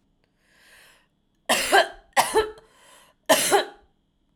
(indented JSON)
{
  "three_cough_length": "4.4 s",
  "three_cough_amplitude": 23572,
  "three_cough_signal_mean_std_ratio": 0.37,
  "survey_phase": "alpha (2021-03-01 to 2021-08-12)",
  "age": "18-44",
  "gender": "Female",
  "wearing_mask": "No",
  "symptom_none": true,
  "smoker_status": "Ex-smoker",
  "respiratory_condition_asthma": false,
  "respiratory_condition_other": false,
  "recruitment_source": "Test and Trace",
  "submission_delay": "0 days",
  "covid_test_result": "Negative",
  "covid_test_method": "LFT"
}